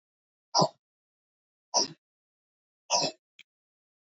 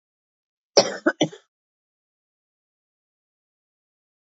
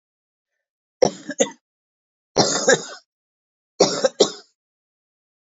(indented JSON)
{
  "exhalation_length": "4.1 s",
  "exhalation_amplitude": 13303,
  "exhalation_signal_mean_std_ratio": 0.26,
  "cough_length": "4.4 s",
  "cough_amplitude": 28381,
  "cough_signal_mean_std_ratio": 0.17,
  "three_cough_length": "5.5 s",
  "three_cough_amplitude": 27214,
  "three_cough_signal_mean_std_ratio": 0.3,
  "survey_phase": "beta (2021-08-13 to 2022-03-07)",
  "age": "65+",
  "gender": "Female",
  "wearing_mask": "No",
  "symptom_none": true,
  "smoker_status": "Ex-smoker",
  "respiratory_condition_asthma": false,
  "respiratory_condition_other": false,
  "recruitment_source": "REACT",
  "submission_delay": "1 day",
  "covid_test_result": "Negative",
  "covid_test_method": "RT-qPCR"
}